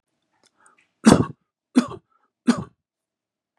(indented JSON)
{
  "three_cough_length": "3.6 s",
  "three_cough_amplitude": 32768,
  "three_cough_signal_mean_std_ratio": 0.23,
  "survey_phase": "beta (2021-08-13 to 2022-03-07)",
  "age": "65+",
  "gender": "Male",
  "wearing_mask": "No",
  "symptom_none": true,
  "smoker_status": "Never smoked",
  "respiratory_condition_asthma": false,
  "respiratory_condition_other": false,
  "recruitment_source": "REACT",
  "submission_delay": "1 day",
  "covid_test_result": "Negative",
  "covid_test_method": "RT-qPCR",
  "influenza_a_test_result": "Negative",
  "influenza_b_test_result": "Negative"
}